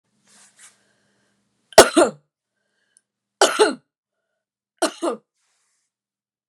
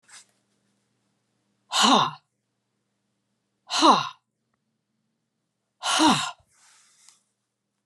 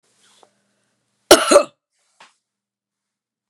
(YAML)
three_cough_length: 6.5 s
three_cough_amplitude: 32768
three_cough_signal_mean_std_ratio: 0.22
exhalation_length: 7.9 s
exhalation_amplitude: 21214
exhalation_signal_mean_std_ratio: 0.29
cough_length: 3.5 s
cough_amplitude: 32768
cough_signal_mean_std_ratio: 0.21
survey_phase: beta (2021-08-13 to 2022-03-07)
age: 45-64
gender: Female
wearing_mask: 'No'
symptom_cough_any: true
symptom_runny_or_blocked_nose: true
symptom_fatigue: true
symptom_fever_high_temperature: true
symptom_change_to_sense_of_smell_or_taste: true
smoker_status: Ex-smoker
respiratory_condition_asthma: false
respiratory_condition_other: false
recruitment_source: Test and Trace
submission_delay: 3 days
covid_test_result: Positive
covid_test_method: LAMP